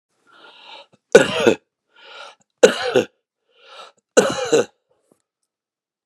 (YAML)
three_cough_length: 6.1 s
three_cough_amplitude: 32768
three_cough_signal_mean_std_ratio: 0.29
survey_phase: beta (2021-08-13 to 2022-03-07)
age: 45-64
gender: Male
wearing_mask: 'No'
symptom_abdominal_pain: true
smoker_status: Ex-smoker
respiratory_condition_asthma: false
respiratory_condition_other: false
recruitment_source: REACT
submission_delay: 2 days
covid_test_result: Negative
covid_test_method: RT-qPCR
influenza_a_test_result: Negative
influenza_b_test_result: Negative